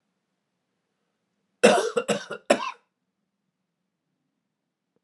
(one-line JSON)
{"three_cough_length": "5.0 s", "three_cough_amplitude": 26840, "three_cough_signal_mean_std_ratio": 0.25, "survey_phase": "alpha (2021-03-01 to 2021-08-12)", "age": "45-64", "gender": "Male", "wearing_mask": "No", "symptom_cough_any": true, "symptom_diarrhoea": true, "symptom_onset": "5 days", "smoker_status": "Never smoked", "respiratory_condition_asthma": true, "respiratory_condition_other": false, "recruitment_source": "Test and Trace", "submission_delay": "2 days", "covid_test_result": "Positive", "covid_test_method": "RT-qPCR"}